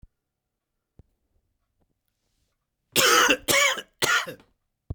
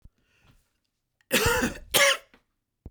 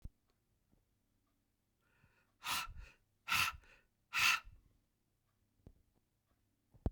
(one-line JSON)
{"three_cough_length": "4.9 s", "three_cough_amplitude": 20527, "three_cough_signal_mean_std_ratio": 0.36, "cough_length": "2.9 s", "cough_amplitude": 17406, "cough_signal_mean_std_ratio": 0.38, "exhalation_length": "6.9 s", "exhalation_amplitude": 3369, "exhalation_signal_mean_std_ratio": 0.28, "survey_phase": "beta (2021-08-13 to 2022-03-07)", "age": "45-64", "gender": "Male", "wearing_mask": "No", "symptom_cough_any": true, "symptom_new_continuous_cough": true, "symptom_runny_or_blocked_nose": true, "symptom_fatigue": true, "symptom_onset": "4 days", "smoker_status": "Never smoked", "respiratory_condition_asthma": false, "respiratory_condition_other": false, "recruitment_source": "Test and Trace", "submission_delay": "2 days", "covid_test_result": "Positive", "covid_test_method": "RT-qPCR"}